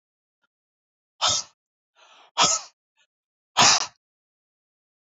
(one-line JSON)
{"exhalation_length": "5.1 s", "exhalation_amplitude": 22943, "exhalation_signal_mean_std_ratio": 0.28, "survey_phase": "beta (2021-08-13 to 2022-03-07)", "age": "45-64", "gender": "Female", "wearing_mask": "Yes", "symptom_none": true, "smoker_status": "Never smoked", "respiratory_condition_asthma": false, "respiratory_condition_other": false, "recruitment_source": "REACT", "submission_delay": "2 days", "covid_test_result": "Negative", "covid_test_method": "RT-qPCR", "influenza_a_test_result": "Negative", "influenza_b_test_result": "Negative"}